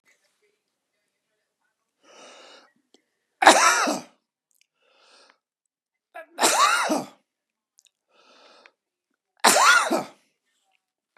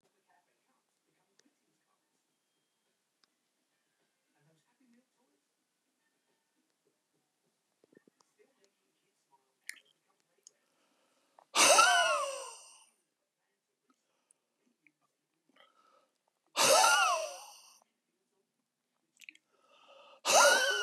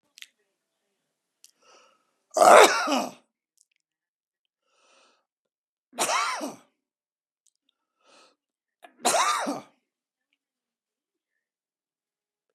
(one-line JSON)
{"three_cough_length": "11.2 s", "three_cough_amplitude": 32767, "three_cough_signal_mean_std_ratio": 0.3, "exhalation_length": "20.8 s", "exhalation_amplitude": 9991, "exhalation_signal_mean_std_ratio": 0.25, "cough_length": "12.5 s", "cough_amplitude": 29687, "cough_signal_mean_std_ratio": 0.23, "survey_phase": "beta (2021-08-13 to 2022-03-07)", "age": "65+", "gender": "Male", "wearing_mask": "No", "symptom_none": true, "smoker_status": "Never smoked", "respiratory_condition_asthma": false, "respiratory_condition_other": true, "recruitment_source": "REACT", "submission_delay": "4 days", "covid_test_result": "Negative", "covid_test_method": "RT-qPCR"}